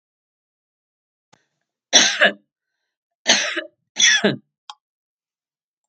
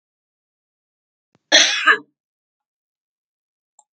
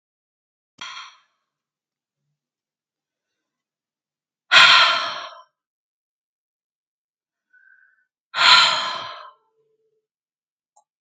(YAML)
three_cough_length: 5.9 s
three_cough_amplitude: 32767
three_cough_signal_mean_std_ratio: 0.31
cough_length: 3.9 s
cough_amplitude: 32767
cough_signal_mean_std_ratio: 0.24
exhalation_length: 11.0 s
exhalation_amplitude: 32767
exhalation_signal_mean_std_ratio: 0.25
survey_phase: beta (2021-08-13 to 2022-03-07)
age: 65+
gender: Male
wearing_mask: 'No'
symptom_none: true
smoker_status: Ex-smoker
respiratory_condition_asthma: false
respiratory_condition_other: false
recruitment_source: Test and Trace
submission_delay: 1 day
covid_test_result: Negative
covid_test_method: LFT